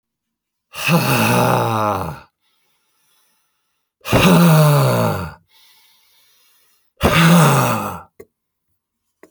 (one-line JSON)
{"exhalation_length": "9.3 s", "exhalation_amplitude": 30091, "exhalation_signal_mean_std_ratio": 0.52, "survey_phase": "alpha (2021-03-01 to 2021-08-12)", "age": "45-64", "gender": "Male", "wearing_mask": "No", "symptom_none": true, "smoker_status": "Ex-smoker", "respiratory_condition_asthma": false, "respiratory_condition_other": false, "recruitment_source": "REACT", "submission_delay": "1 day", "covid_test_result": "Negative", "covid_test_method": "RT-qPCR"}